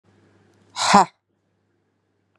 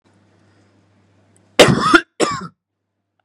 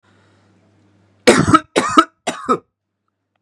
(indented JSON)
{
  "exhalation_length": "2.4 s",
  "exhalation_amplitude": 32767,
  "exhalation_signal_mean_std_ratio": 0.24,
  "cough_length": "3.2 s",
  "cough_amplitude": 32768,
  "cough_signal_mean_std_ratio": 0.31,
  "three_cough_length": "3.4 s",
  "three_cough_amplitude": 32768,
  "three_cough_signal_mean_std_ratio": 0.33,
  "survey_phase": "beta (2021-08-13 to 2022-03-07)",
  "age": "18-44",
  "gender": "Male",
  "wearing_mask": "No",
  "symptom_none": true,
  "smoker_status": "Never smoked",
  "respiratory_condition_asthma": false,
  "respiratory_condition_other": false,
  "recruitment_source": "REACT",
  "submission_delay": "1 day",
  "covid_test_result": "Negative",
  "covid_test_method": "RT-qPCR",
  "influenza_a_test_result": "Negative",
  "influenza_b_test_result": "Negative"
}